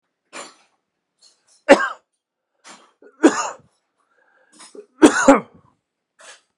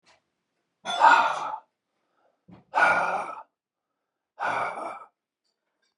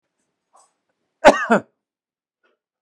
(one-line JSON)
{"three_cough_length": "6.6 s", "three_cough_amplitude": 32768, "three_cough_signal_mean_std_ratio": 0.24, "exhalation_length": "6.0 s", "exhalation_amplitude": 19536, "exhalation_signal_mean_std_ratio": 0.38, "cough_length": "2.8 s", "cough_amplitude": 32768, "cough_signal_mean_std_ratio": 0.21, "survey_phase": "beta (2021-08-13 to 2022-03-07)", "age": "45-64", "gender": "Male", "wearing_mask": "No", "symptom_fatigue": true, "symptom_change_to_sense_of_smell_or_taste": true, "smoker_status": "Never smoked", "respiratory_condition_asthma": false, "respiratory_condition_other": false, "recruitment_source": "REACT", "submission_delay": "9 days", "covid_test_result": "Negative", "covid_test_method": "RT-qPCR", "influenza_a_test_result": "Unknown/Void", "influenza_b_test_result": "Unknown/Void"}